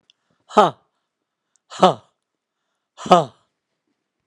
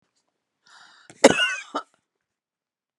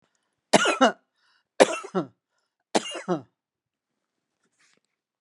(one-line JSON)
{"exhalation_length": "4.3 s", "exhalation_amplitude": 32768, "exhalation_signal_mean_std_ratio": 0.22, "cough_length": "3.0 s", "cough_amplitude": 32767, "cough_signal_mean_std_ratio": 0.22, "three_cough_length": "5.2 s", "three_cough_amplitude": 30128, "three_cough_signal_mean_std_ratio": 0.26, "survey_phase": "beta (2021-08-13 to 2022-03-07)", "age": "65+", "gender": "Female", "wearing_mask": "No", "symptom_none": true, "smoker_status": "Ex-smoker", "respiratory_condition_asthma": true, "respiratory_condition_other": false, "recruitment_source": "REACT", "submission_delay": "2 days", "covid_test_result": "Negative", "covid_test_method": "RT-qPCR", "influenza_a_test_result": "Unknown/Void", "influenza_b_test_result": "Unknown/Void"}